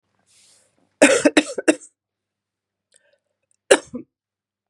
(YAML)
cough_length: 4.7 s
cough_amplitude: 32768
cough_signal_mean_std_ratio: 0.24
survey_phase: beta (2021-08-13 to 2022-03-07)
age: 45-64
gender: Female
wearing_mask: 'No'
symptom_cough_any: true
symptom_runny_or_blocked_nose: true
symptom_sore_throat: true
symptom_fatigue: true
symptom_fever_high_temperature: true
symptom_headache: true
symptom_onset: 4 days
smoker_status: Never smoked
respiratory_condition_asthma: false
respiratory_condition_other: false
recruitment_source: Test and Trace
submission_delay: 1 day
covid_test_result: Positive
covid_test_method: RT-qPCR
covid_ct_value: 14.3
covid_ct_gene: ORF1ab gene
covid_ct_mean: 14.5
covid_viral_load: 18000000 copies/ml
covid_viral_load_category: High viral load (>1M copies/ml)